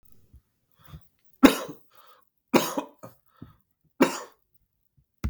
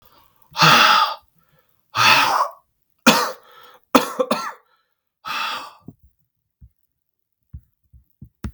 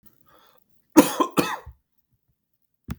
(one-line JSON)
{"three_cough_length": "5.3 s", "three_cough_amplitude": 32768, "three_cough_signal_mean_std_ratio": 0.23, "exhalation_length": "8.5 s", "exhalation_amplitude": 32768, "exhalation_signal_mean_std_ratio": 0.37, "cough_length": "3.0 s", "cough_amplitude": 32768, "cough_signal_mean_std_ratio": 0.24, "survey_phase": "beta (2021-08-13 to 2022-03-07)", "age": "18-44", "gender": "Male", "wearing_mask": "No", "symptom_cough_any": true, "symptom_new_continuous_cough": true, "symptom_runny_or_blocked_nose": true, "symptom_shortness_of_breath": true, "symptom_sore_throat": true, "symptom_diarrhoea": true, "symptom_fatigue": true, "symptom_headache": true, "symptom_onset": "6 days", "smoker_status": "Never smoked", "respiratory_condition_asthma": false, "respiratory_condition_other": false, "recruitment_source": "REACT", "submission_delay": "1 day", "covid_test_result": "Negative", "covid_test_method": "RT-qPCR", "influenza_a_test_result": "Positive", "influenza_a_ct_value": 21.0, "influenza_b_test_result": "Negative"}